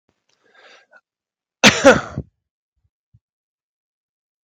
{"cough_length": "4.4 s", "cough_amplitude": 32768, "cough_signal_mean_std_ratio": 0.21, "survey_phase": "beta (2021-08-13 to 2022-03-07)", "age": "45-64", "gender": "Male", "wearing_mask": "No", "symptom_none": true, "smoker_status": "Never smoked", "respiratory_condition_asthma": false, "respiratory_condition_other": false, "recruitment_source": "REACT", "submission_delay": "1 day", "covid_test_result": "Negative", "covid_test_method": "RT-qPCR", "influenza_a_test_result": "Unknown/Void", "influenza_b_test_result": "Unknown/Void"}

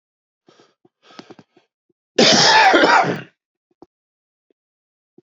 {"cough_length": "5.3 s", "cough_amplitude": 30218, "cough_signal_mean_std_ratio": 0.36, "survey_phase": "beta (2021-08-13 to 2022-03-07)", "age": "45-64", "gender": "Male", "wearing_mask": "No", "symptom_cough_any": true, "smoker_status": "Never smoked", "respiratory_condition_asthma": false, "respiratory_condition_other": false, "recruitment_source": "Test and Trace", "submission_delay": "2 days", "covid_test_result": "Positive", "covid_test_method": "RT-qPCR"}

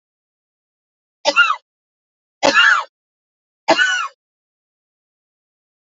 {"three_cough_length": "5.8 s", "three_cough_amplitude": 30367, "three_cough_signal_mean_std_ratio": 0.32, "survey_phase": "alpha (2021-03-01 to 2021-08-12)", "age": "45-64", "gender": "Female", "wearing_mask": "No", "symptom_none": true, "smoker_status": "Ex-smoker", "respiratory_condition_asthma": false, "respiratory_condition_other": false, "recruitment_source": "REACT", "submission_delay": "2 days", "covid_test_result": "Negative", "covid_test_method": "RT-qPCR"}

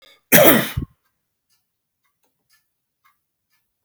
{"cough_length": "3.8 s", "cough_amplitude": 32768, "cough_signal_mean_std_ratio": 0.24, "survey_phase": "alpha (2021-03-01 to 2021-08-12)", "age": "65+", "gender": "Male", "wearing_mask": "No", "symptom_none": true, "smoker_status": "Never smoked", "respiratory_condition_asthma": false, "respiratory_condition_other": false, "recruitment_source": "REACT", "submission_delay": "3 days", "covid_test_result": "Negative", "covid_test_method": "RT-qPCR"}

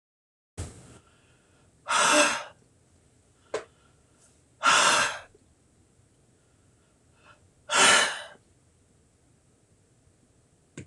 {"exhalation_length": "10.9 s", "exhalation_amplitude": 15931, "exhalation_signal_mean_std_ratio": 0.32, "survey_phase": "alpha (2021-03-01 to 2021-08-12)", "age": "65+", "gender": "Male", "wearing_mask": "No", "symptom_none": true, "smoker_status": "Ex-smoker", "respiratory_condition_asthma": false, "respiratory_condition_other": false, "recruitment_source": "REACT", "submission_delay": "1 day", "covid_test_result": "Negative", "covid_test_method": "RT-qPCR"}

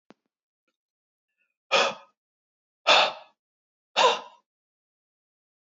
{"exhalation_length": "5.6 s", "exhalation_amplitude": 17554, "exhalation_signal_mean_std_ratio": 0.27, "survey_phase": "beta (2021-08-13 to 2022-03-07)", "age": "45-64", "gender": "Male", "wearing_mask": "No", "symptom_none": true, "smoker_status": "Never smoked", "respiratory_condition_asthma": false, "respiratory_condition_other": false, "recruitment_source": "REACT", "submission_delay": "1 day", "covid_test_result": "Negative", "covid_test_method": "RT-qPCR", "influenza_a_test_result": "Negative", "influenza_b_test_result": "Negative"}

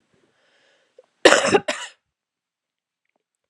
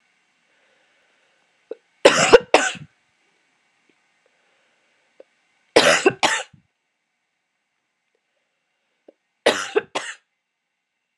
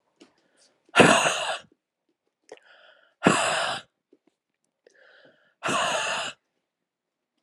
{"cough_length": "3.5 s", "cough_amplitude": 32768, "cough_signal_mean_std_ratio": 0.24, "three_cough_length": "11.2 s", "three_cough_amplitude": 32768, "three_cough_signal_mean_std_ratio": 0.24, "exhalation_length": "7.4 s", "exhalation_amplitude": 26833, "exhalation_signal_mean_std_ratio": 0.35, "survey_phase": "beta (2021-08-13 to 2022-03-07)", "age": "18-44", "gender": "Female", "wearing_mask": "No", "symptom_cough_any": true, "symptom_runny_or_blocked_nose": true, "symptom_headache": true, "symptom_change_to_sense_of_smell_or_taste": true, "symptom_loss_of_taste": true, "symptom_onset": "7 days", "smoker_status": "Never smoked", "respiratory_condition_asthma": false, "respiratory_condition_other": false, "recruitment_source": "Test and Trace", "submission_delay": "5 days", "covid_test_result": "Positive", "covid_test_method": "RT-qPCR", "covid_ct_value": 21.9, "covid_ct_gene": "ORF1ab gene", "covid_ct_mean": 23.0, "covid_viral_load": "29000 copies/ml", "covid_viral_load_category": "Low viral load (10K-1M copies/ml)"}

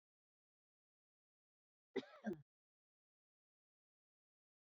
{"cough_length": "4.6 s", "cough_amplitude": 949, "cough_signal_mean_std_ratio": 0.17, "survey_phase": "beta (2021-08-13 to 2022-03-07)", "age": "65+", "gender": "Female", "wearing_mask": "No", "symptom_cough_any": true, "symptom_runny_or_blocked_nose": true, "symptom_sore_throat": true, "symptom_fatigue": true, "symptom_headache": true, "symptom_loss_of_taste": true, "symptom_onset": "15 days", "smoker_status": "Never smoked", "respiratory_condition_asthma": false, "respiratory_condition_other": false, "recruitment_source": "Test and Trace", "submission_delay": "2 days", "covid_test_result": "Positive", "covid_test_method": "RT-qPCR", "covid_ct_value": 34.9, "covid_ct_gene": "ORF1ab gene"}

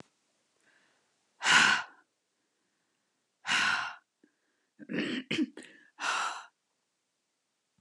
{"exhalation_length": "7.8 s", "exhalation_amplitude": 10453, "exhalation_signal_mean_std_ratio": 0.35, "survey_phase": "beta (2021-08-13 to 2022-03-07)", "age": "45-64", "gender": "Female", "wearing_mask": "No", "symptom_cough_any": true, "symptom_runny_or_blocked_nose": true, "symptom_shortness_of_breath": true, "symptom_sore_throat": true, "symptom_fatigue": true, "symptom_headache": true, "symptom_change_to_sense_of_smell_or_taste": true, "symptom_onset": "5 days", "smoker_status": "Never smoked", "respiratory_condition_asthma": false, "respiratory_condition_other": false, "recruitment_source": "REACT", "submission_delay": "6 days", "covid_test_result": "Positive", "covid_test_method": "RT-qPCR", "covid_ct_value": 23.0, "covid_ct_gene": "E gene", "influenza_a_test_result": "Negative", "influenza_b_test_result": "Negative"}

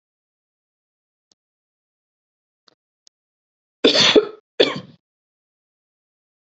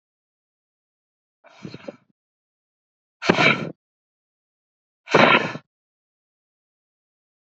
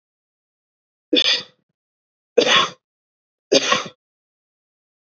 {"cough_length": "6.6 s", "cough_amplitude": 28700, "cough_signal_mean_std_ratio": 0.22, "exhalation_length": "7.4 s", "exhalation_amplitude": 32767, "exhalation_signal_mean_std_ratio": 0.24, "three_cough_length": "5.0 s", "three_cough_amplitude": 30607, "three_cough_signal_mean_std_ratio": 0.32, "survey_phase": "beta (2021-08-13 to 2022-03-07)", "age": "45-64", "gender": "Female", "wearing_mask": "No", "symptom_none": true, "smoker_status": "Ex-smoker", "respiratory_condition_asthma": false, "respiratory_condition_other": false, "recruitment_source": "REACT", "submission_delay": "4 days", "covid_test_result": "Negative", "covid_test_method": "RT-qPCR", "influenza_a_test_result": "Negative", "influenza_b_test_result": "Negative"}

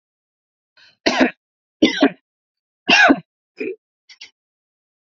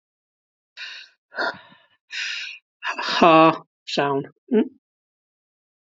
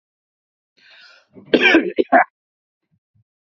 {"three_cough_length": "5.1 s", "three_cough_amplitude": 28561, "three_cough_signal_mean_std_ratio": 0.31, "exhalation_length": "5.8 s", "exhalation_amplitude": 27425, "exhalation_signal_mean_std_ratio": 0.36, "cough_length": "3.4 s", "cough_amplitude": 28341, "cough_signal_mean_std_ratio": 0.3, "survey_phase": "alpha (2021-03-01 to 2021-08-12)", "age": "45-64", "gender": "Male", "wearing_mask": "No", "symptom_none": true, "symptom_onset": "1 day", "smoker_status": "Never smoked", "recruitment_source": "Test and Trace", "submission_delay": "0 days", "covid_test_result": "Negative", "covid_test_method": "RT-qPCR"}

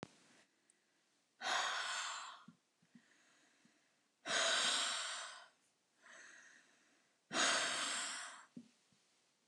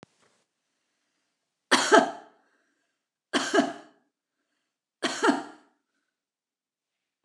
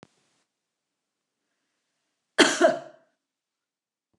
{"exhalation_length": "9.5 s", "exhalation_amplitude": 2572, "exhalation_signal_mean_std_ratio": 0.47, "three_cough_length": "7.2 s", "three_cough_amplitude": 18533, "three_cough_signal_mean_std_ratio": 0.27, "cough_length": "4.2 s", "cough_amplitude": 26731, "cough_signal_mean_std_ratio": 0.21, "survey_phase": "beta (2021-08-13 to 2022-03-07)", "age": "65+", "gender": "Female", "wearing_mask": "No", "symptom_none": true, "smoker_status": "Never smoked", "respiratory_condition_asthma": true, "respiratory_condition_other": false, "recruitment_source": "REACT", "submission_delay": "2 days", "covid_test_result": "Negative", "covid_test_method": "RT-qPCR"}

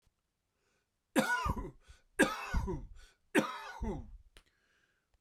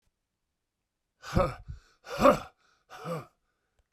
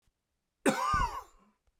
{"three_cough_length": "5.2 s", "three_cough_amplitude": 7347, "three_cough_signal_mean_std_ratio": 0.41, "exhalation_length": "3.9 s", "exhalation_amplitude": 14051, "exhalation_signal_mean_std_ratio": 0.28, "cough_length": "1.8 s", "cough_amplitude": 8590, "cough_signal_mean_std_ratio": 0.44, "survey_phase": "beta (2021-08-13 to 2022-03-07)", "age": "45-64", "gender": "Male", "wearing_mask": "No", "symptom_cough_any": true, "symptom_fatigue": true, "symptom_other": true, "smoker_status": "Never smoked", "respiratory_condition_asthma": false, "respiratory_condition_other": false, "recruitment_source": "Test and Trace", "submission_delay": "2 days", "covid_test_result": "Positive", "covid_test_method": "RT-qPCR", "covid_ct_value": 25.7, "covid_ct_gene": "ORF1ab gene"}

